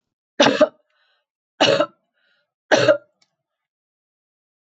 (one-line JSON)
{"three_cough_length": "4.6 s", "three_cough_amplitude": 27316, "three_cough_signal_mean_std_ratio": 0.31, "survey_phase": "beta (2021-08-13 to 2022-03-07)", "age": "65+", "gender": "Female", "wearing_mask": "No", "symptom_none": true, "smoker_status": "Never smoked", "respiratory_condition_asthma": false, "respiratory_condition_other": false, "recruitment_source": "REACT", "submission_delay": "6 days", "covid_test_result": "Negative", "covid_test_method": "RT-qPCR"}